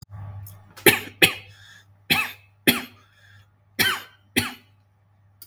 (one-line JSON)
{"three_cough_length": "5.5 s", "three_cough_amplitude": 32767, "three_cough_signal_mean_std_ratio": 0.32, "survey_phase": "beta (2021-08-13 to 2022-03-07)", "age": "18-44", "gender": "Male", "wearing_mask": "Yes", "symptom_none": true, "smoker_status": "Never smoked", "respiratory_condition_asthma": false, "respiratory_condition_other": false, "recruitment_source": "REACT", "submission_delay": "2 days", "covid_test_result": "Negative", "covid_test_method": "RT-qPCR", "influenza_a_test_result": "Negative", "influenza_b_test_result": "Negative"}